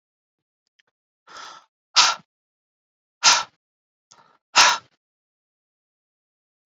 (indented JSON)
{
  "exhalation_length": "6.7 s",
  "exhalation_amplitude": 29905,
  "exhalation_signal_mean_std_ratio": 0.23,
  "survey_phase": "beta (2021-08-13 to 2022-03-07)",
  "age": "18-44",
  "gender": "Female",
  "wearing_mask": "No",
  "symptom_cough_any": true,
  "symptom_runny_or_blocked_nose": true,
  "symptom_fatigue": true,
  "symptom_fever_high_temperature": true,
  "symptom_headache": true,
  "smoker_status": "Ex-smoker",
  "respiratory_condition_asthma": false,
  "respiratory_condition_other": false,
  "recruitment_source": "Test and Trace",
  "submission_delay": "2 days",
  "covid_test_result": "Positive",
  "covid_test_method": "RT-qPCR",
  "covid_ct_value": 24.0,
  "covid_ct_gene": "ORF1ab gene",
  "covid_ct_mean": 24.7,
  "covid_viral_load": "8100 copies/ml",
  "covid_viral_load_category": "Minimal viral load (< 10K copies/ml)"
}